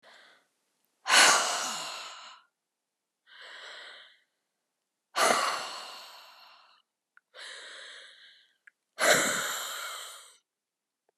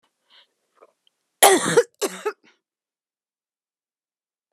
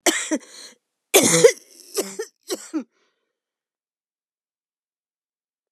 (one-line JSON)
{"exhalation_length": "11.2 s", "exhalation_amplitude": 15853, "exhalation_signal_mean_std_ratio": 0.36, "cough_length": "4.5 s", "cough_amplitude": 32768, "cough_signal_mean_std_ratio": 0.24, "three_cough_length": "5.7 s", "three_cough_amplitude": 31965, "three_cough_signal_mean_std_ratio": 0.28, "survey_phase": "beta (2021-08-13 to 2022-03-07)", "age": "45-64", "gender": "Female", "wearing_mask": "No", "symptom_cough_any": true, "symptom_new_continuous_cough": true, "symptom_runny_or_blocked_nose": true, "symptom_shortness_of_breath": true, "symptom_sore_throat": true, "symptom_fatigue": true, "symptom_headache": true, "symptom_change_to_sense_of_smell_or_taste": true, "symptom_loss_of_taste": true, "symptom_other": true, "smoker_status": "Never smoked", "respiratory_condition_asthma": true, "respiratory_condition_other": false, "recruitment_source": "Test and Trace", "submission_delay": "2 days", "covid_test_result": "Positive", "covid_test_method": "LFT"}